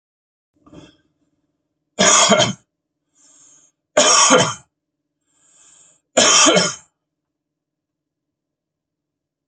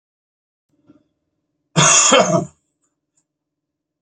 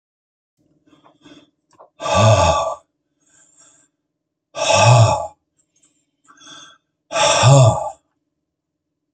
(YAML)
three_cough_length: 9.5 s
three_cough_amplitude: 32768
three_cough_signal_mean_std_ratio: 0.34
cough_length: 4.0 s
cough_amplitude: 32767
cough_signal_mean_std_ratio: 0.33
exhalation_length: 9.1 s
exhalation_amplitude: 31825
exhalation_signal_mean_std_ratio: 0.39
survey_phase: beta (2021-08-13 to 2022-03-07)
age: 65+
gender: Male
wearing_mask: 'No'
symptom_none: true
smoker_status: Ex-smoker
respiratory_condition_asthma: false
respiratory_condition_other: false
recruitment_source: REACT
submission_delay: 1 day
covid_test_result: Negative
covid_test_method: RT-qPCR
influenza_a_test_result: Negative
influenza_b_test_result: Negative